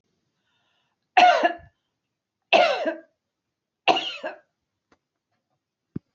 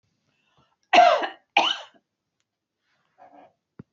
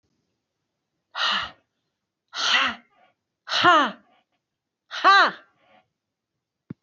{
  "three_cough_length": "6.1 s",
  "three_cough_amplitude": 22559,
  "three_cough_signal_mean_std_ratio": 0.3,
  "cough_length": "3.9 s",
  "cough_amplitude": 26625,
  "cough_signal_mean_std_ratio": 0.28,
  "exhalation_length": "6.8 s",
  "exhalation_amplitude": 20812,
  "exhalation_signal_mean_std_ratio": 0.34,
  "survey_phase": "alpha (2021-03-01 to 2021-08-12)",
  "age": "45-64",
  "gender": "Female",
  "wearing_mask": "No",
  "symptom_fatigue": true,
  "symptom_onset": "11 days",
  "smoker_status": "Never smoked",
  "respiratory_condition_asthma": false,
  "respiratory_condition_other": false,
  "recruitment_source": "REACT",
  "submission_delay": "31 days",
  "covid_test_result": "Negative",
  "covid_test_method": "RT-qPCR"
}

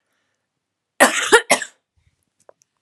{
  "cough_length": "2.8 s",
  "cough_amplitude": 32768,
  "cough_signal_mean_std_ratio": 0.28,
  "survey_phase": "alpha (2021-03-01 to 2021-08-12)",
  "age": "18-44",
  "gender": "Female",
  "wearing_mask": "No",
  "symptom_fatigue": true,
  "symptom_onset": "3 days",
  "smoker_status": "Never smoked",
  "respiratory_condition_asthma": false,
  "respiratory_condition_other": false,
  "recruitment_source": "Test and Trace",
  "submission_delay": "2 days",
  "covid_test_result": "Positive",
  "covid_test_method": "RT-qPCR",
  "covid_ct_value": 15.9,
  "covid_ct_gene": "N gene",
  "covid_ct_mean": 16.2,
  "covid_viral_load": "5000000 copies/ml",
  "covid_viral_load_category": "High viral load (>1M copies/ml)"
}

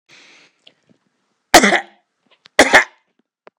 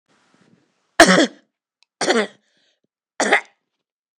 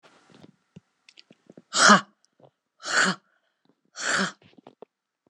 {
  "cough_length": "3.6 s",
  "cough_amplitude": 32767,
  "cough_signal_mean_std_ratio": 0.28,
  "three_cough_length": "4.2 s",
  "three_cough_amplitude": 30424,
  "three_cough_signal_mean_std_ratio": 0.3,
  "exhalation_length": "5.3 s",
  "exhalation_amplitude": 27680,
  "exhalation_signal_mean_std_ratio": 0.28,
  "survey_phase": "beta (2021-08-13 to 2022-03-07)",
  "age": "45-64",
  "gender": "Female",
  "wearing_mask": "No",
  "symptom_none": true,
  "smoker_status": "Never smoked",
  "respiratory_condition_asthma": false,
  "respiratory_condition_other": false,
  "recruitment_source": "REACT",
  "submission_delay": "1 day",
  "covid_test_result": "Negative",
  "covid_test_method": "RT-qPCR",
  "influenza_a_test_result": "Negative",
  "influenza_b_test_result": "Negative"
}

